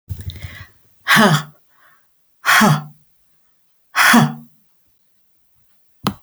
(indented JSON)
{
  "exhalation_length": "6.2 s",
  "exhalation_amplitude": 32044,
  "exhalation_signal_mean_std_ratio": 0.38,
  "survey_phase": "alpha (2021-03-01 to 2021-08-12)",
  "age": "65+",
  "gender": "Female",
  "wearing_mask": "No",
  "symptom_none": true,
  "smoker_status": "Never smoked",
  "respiratory_condition_asthma": false,
  "respiratory_condition_other": false,
  "recruitment_source": "REACT",
  "submission_delay": "2 days",
  "covid_test_result": "Negative",
  "covid_test_method": "RT-qPCR"
}